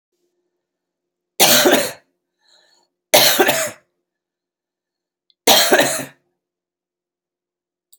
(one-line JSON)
{"three_cough_length": "8.0 s", "three_cough_amplitude": 32768, "three_cough_signal_mean_std_ratio": 0.34, "survey_phase": "beta (2021-08-13 to 2022-03-07)", "age": "45-64", "gender": "Female", "wearing_mask": "No", "symptom_none": true, "smoker_status": "Current smoker (11 or more cigarettes per day)", "respiratory_condition_asthma": false, "respiratory_condition_other": false, "recruitment_source": "REACT", "submission_delay": "1 day", "covid_test_result": "Negative", "covid_test_method": "RT-qPCR", "influenza_a_test_result": "Negative", "influenza_b_test_result": "Negative"}